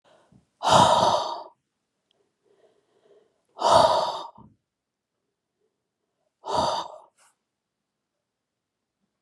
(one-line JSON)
{"exhalation_length": "9.2 s", "exhalation_amplitude": 20200, "exhalation_signal_mean_std_ratio": 0.32, "survey_phase": "beta (2021-08-13 to 2022-03-07)", "age": "45-64", "gender": "Female", "wearing_mask": "No", "symptom_none": true, "smoker_status": "Ex-smoker", "respiratory_condition_asthma": false, "respiratory_condition_other": false, "recruitment_source": "REACT", "submission_delay": "1 day", "covid_test_result": "Negative", "covid_test_method": "RT-qPCR"}